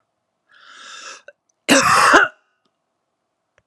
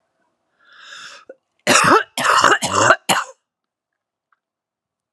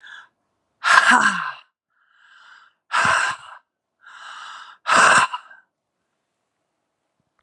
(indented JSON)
{
  "cough_length": "3.7 s",
  "cough_amplitude": 32767,
  "cough_signal_mean_std_ratio": 0.35,
  "three_cough_length": "5.1 s",
  "three_cough_amplitude": 32768,
  "three_cough_signal_mean_std_ratio": 0.39,
  "exhalation_length": "7.4 s",
  "exhalation_amplitude": 32768,
  "exhalation_signal_mean_std_ratio": 0.37,
  "survey_phase": "beta (2021-08-13 to 2022-03-07)",
  "age": "45-64",
  "gender": "Female",
  "wearing_mask": "No",
  "symptom_cough_any": true,
  "symptom_new_continuous_cough": true,
  "symptom_runny_or_blocked_nose": true,
  "symptom_sore_throat": true,
  "symptom_abdominal_pain": true,
  "symptom_fatigue": true,
  "symptom_headache": true,
  "symptom_other": true,
  "smoker_status": "Never smoked",
  "respiratory_condition_asthma": false,
  "respiratory_condition_other": false,
  "recruitment_source": "Test and Trace",
  "submission_delay": "1 day",
  "covid_test_result": "Positive",
  "covid_test_method": "RT-qPCR"
}